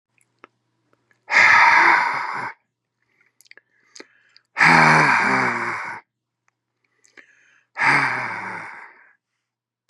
{"exhalation_length": "9.9 s", "exhalation_amplitude": 31506, "exhalation_signal_mean_std_ratio": 0.43, "survey_phase": "beta (2021-08-13 to 2022-03-07)", "age": "65+", "gender": "Male", "wearing_mask": "No", "symptom_none": true, "smoker_status": "Never smoked", "respiratory_condition_asthma": false, "respiratory_condition_other": false, "recruitment_source": "REACT", "submission_delay": "1 day", "covid_test_result": "Negative", "covid_test_method": "RT-qPCR", "influenza_a_test_result": "Negative", "influenza_b_test_result": "Negative"}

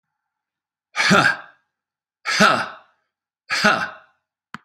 {"exhalation_length": "4.6 s", "exhalation_amplitude": 32768, "exhalation_signal_mean_std_ratio": 0.39, "survey_phase": "beta (2021-08-13 to 2022-03-07)", "age": "65+", "gender": "Male", "wearing_mask": "No", "symptom_none": true, "smoker_status": "Never smoked", "respiratory_condition_asthma": false, "respiratory_condition_other": true, "recruitment_source": "REACT", "submission_delay": "3 days", "covid_test_result": "Negative", "covid_test_method": "RT-qPCR", "influenza_a_test_result": "Negative", "influenza_b_test_result": "Negative"}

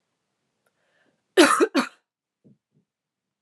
{"cough_length": "3.4 s", "cough_amplitude": 25847, "cough_signal_mean_std_ratio": 0.26, "survey_phase": "beta (2021-08-13 to 2022-03-07)", "age": "18-44", "gender": "Female", "wearing_mask": "Yes", "symptom_runny_or_blocked_nose": true, "symptom_sore_throat": true, "symptom_fatigue": true, "symptom_headache": true, "symptom_onset": "4 days", "smoker_status": "Never smoked", "respiratory_condition_asthma": false, "respiratory_condition_other": false, "recruitment_source": "Test and Trace", "submission_delay": "1 day", "covid_test_result": "Positive", "covid_test_method": "RT-qPCR", "covid_ct_value": 24.8, "covid_ct_gene": "N gene"}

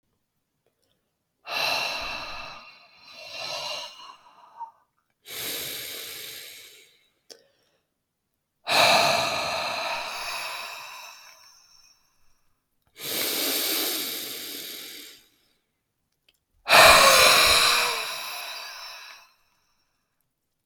{"exhalation_length": "20.7 s", "exhalation_amplitude": 31904, "exhalation_signal_mean_std_ratio": 0.4, "survey_phase": "beta (2021-08-13 to 2022-03-07)", "age": "18-44", "gender": "Male", "wearing_mask": "No", "symptom_new_continuous_cough": true, "symptom_runny_or_blocked_nose": true, "symptom_sore_throat": true, "symptom_fatigue": true, "symptom_headache": true, "symptom_onset": "3 days", "smoker_status": "Never smoked", "respiratory_condition_asthma": false, "respiratory_condition_other": false, "recruitment_source": "Test and Trace", "submission_delay": "2 days", "covid_test_result": "Positive", "covid_test_method": "RT-qPCR", "covid_ct_value": 21.0, "covid_ct_gene": "ORF1ab gene", "covid_ct_mean": 21.6, "covid_viral_load": "79000 copies/ml", "covid_viral_load_category": "Low viral load (10K-1M copies/ml)"}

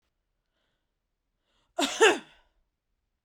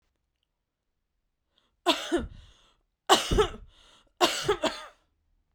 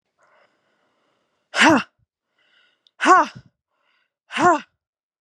{"cough_length": "3.2 s", "cough_amplitude": 14559, "cough_signal_mean_std_ratio": 0.23, "three_cough_length": "5.5 s", "three_cough_amplitude": 25470, "three_cough_signal_mean_std_ratio": 0.33, "exhalation_length": "5.2 s", "exhalation_amplitude": 28040, "exhalation_signal_mean_std_ratio": 0.29, "survey_phase": "beta (2021-08-13 to 2022-03-07)", "age": "18-44", "gender": "Female", "wearing_mask": "No", "symptom_none": true, "smoker_status": "Ex-smoker", "respiratory_condition_asthma": false, "respiratory_condition_other": false, "recruitment_source": "REACT", "submission_delay": "9 days", "covid_test_result": "Negative", "covid_test_method": "RT-qPCR"}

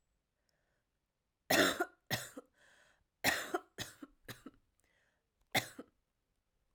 {"three_cough_length": "6.7 s", "three_cough_amplitude": 5492, "three_cough_signal_mean_std_ratio": 0.28, "survey_phase": "alpha (2021-03-01 to 2021-08-12)", "age": "18-44", "gender": "Female", "wearing_mask": "No", "symptom_new_continuous_cough": true, "symptom_fatigue": true, "symptom_headache": true, "symptom_change_to_sense_of_smell_or_taste": true, "smoker_status": "Never smoked", "respiratory_condition_asthma": false, "respiratory_condition_other": false, "recruitment_source": "Test and Trace", "submission_delay": "1 day", "covid_test_result": "Positive", "covid_test_method": "RT-qPCR"}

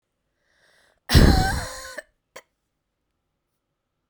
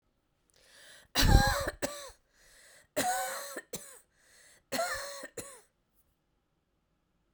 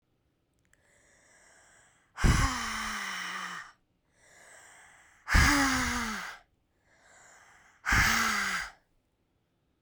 {"cough_length": "4.1 s", "cough_amplitude": 28810, "cough_signal_mean_std_ratio": 0.28, "three_cough_length": "7.3 s", "three_cough_amplitude": 13358, "three_cough_signal_mean_std_ratio": 0.35, "exhalation_length": "9.8 s", "exhalation_amplitude": 10011, "exhalation_signal_mean_std_ratio": 0.43, "survey_phase": "beta (2021-08-13 to 2022-03-07)", "age": "45-64", "gender": "Female", "wearing_mask": "No", "symptom_runny_or_blocked_nose": true, "symptom_headache": true, "symptom_onset": "2 days", "smoker_status": "Never smoked", "respiratory_condition_asthma": false, "respiratory_condition_other": false, "recruitment_source": "Test and Trace", "submission_delay": "1 day", "covid_test_result": "Positive", "covid_test_method": "RT-qPCR", "covid_ct_value": 22.0, "covid_ct_gene": "ORF1ab gene"}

